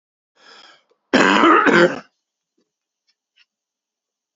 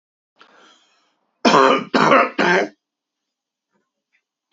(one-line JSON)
{"cough_length": "4.4 s", "cough_amplitude": 32767, "cough_signal_mean_std_ratio": 0.35, "three_cough_length": "4.5 s", "three_cough_amplitude": 27502, "three_cough_signal_mean_std_ratio": 0.38, "survey_phase": "alpha (2021-03-01 to 2021-08-12)", "age": "45-64", "gender": "Male", "wearing_mask": "No", "symptom_none": true, "smoker_status": "Never smoked", "respiratory_condition_asthma": true, "respiratory_condition_other": false, "recruitment_source": "REACT", "submission_delay": "5 days", "covid_test_result": "Negative", "covid_test_method": "RT-qPCR"}